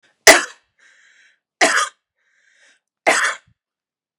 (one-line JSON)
{"three_cough_length": "4.2 s", "three_cough_amplitude": 32768, "three_cough_signal_mean_std_ratio": 0.28, "survey_phase": "beta (2021-08-13 to 2022-03-07)", "age": "45-64", "gender": "Female", "wearing_mask": "No", "symptom_none": true, "smoker_status": "Current smoker (1 to 10 cigarettes per day)", "respiratory_condition_asthma": false, "respiratory_condition_other": false, "recruitment_source": "REACT", "submission_delay": "7 days", "covid_test_result": "Negative", "covid_test_method": "RT-qPCR", "influenza_a_test_result": "Negative", "influenza_b_test_result": "Negative"}